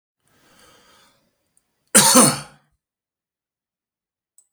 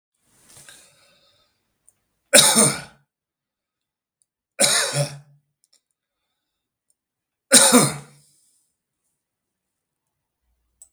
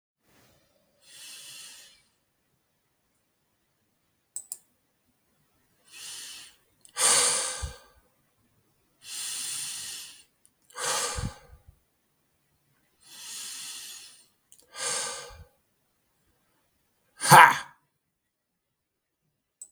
{"cough_length": "4.5 s", "cough_amplitude": 32768, "cough_signal_mean_std_ratio": 0.24, "three_cough_length": "10.9 s", "three_cough_amplitude": 32768, "three_cough_signal_mean_std_ratio": 0.26, "exhalation_length": "19.7 s", "exhalation_amplitude": 32768, "exhalation_signal_mean_std_ratio": 0.23, "survey_phase": "beta (2021-08-13 to 2022-03-07)", "age": "45-64", "gender": "Male", "wearing_mask": "No", "symptom_none": true, "smoker_status": "Never smoked", "respiratory_condition_asthma": false, "respiratory_condition_other": false, "recruitment_source": "REACT", "submission_delay": "4 days", "covid_test_result": "Negative", "covid_test_method": "RT-qPCR", "influenza_a_test_result": "Negative", "influenza_b_test_result": "Negative"}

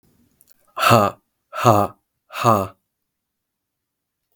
{"exhalation_length": "4.4 s", "exhalation_amplitude": 32766, "exhalation_signal_mean_std_ratio": 0.34, "survey_phase": "alpha (2021-03-01 to 2021-08-12)", "age": "45-64", "gender": "Male", "wearing_mask": "No", "symptom_cough_any": true, "symptom_fatigue": true, "symptom_fever_high_temperature": true, "symptom_change_to_sense_of_smell_or_taste": true, "symptom_loss_of_taste": true, "symptom_onset": "9 days", "smoker_status": "Never smoked", "respiratory_condition_asthma": false, "respiratory_condition_other": false, "recruitment_source": "Test and Trace", "submission_delay": "1 day", "covid_test_result": "Positive", "covid_test_method": "RT-qPCR"}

